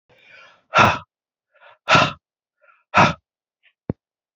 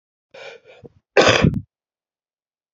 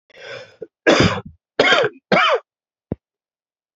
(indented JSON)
{
  "exhalation_length": "4.4 s",
  "exhalation_amplitude": 31158,
  "exhalation_signal_mean_std_ratio": 0.3,
  "cough_length": "2.7 s",
  "cough_amplitude": 32768,
  "cough_signal_mean_std_ratio": 0.31,
  "three_cough_length": "3.8 s",
  "three_cough_amplitude": 28587,
  "three_cough_signal_mean_std_ratio": 0.42,
  "survey_phase": "beta (2021-08-13 to 2022-03-07)",
  "age": "45-64",
  "gender": "Male",
  "wearing_mask": "No",
  "symptom_cough_any": true,
  "symptom_new_continuous_cough": true,
  "symptom_runny_or_blocked_nose": true,
  "symptom_sore_throat": true,
  "symptom_abdominal_pain": true,
  "symptom_fatigue": true,
  "symptom_fever_high_temperature": true,
  "symptom_headache": true,
  "symptom_change_to_sense_of_smell_or_taste": true,
  "symptom_loss_of_taste": true,
  "smoker_status": "Never smoked",
  "respiratory_condition_asthma": false,
  "respiratory_condition_other": false,
  "recruitment_source": "Test and Trace",
  "submission_delay": "2 days",
  "covid_test_result": "Positive",
  "covid_test_method": "RT-qPCR"
}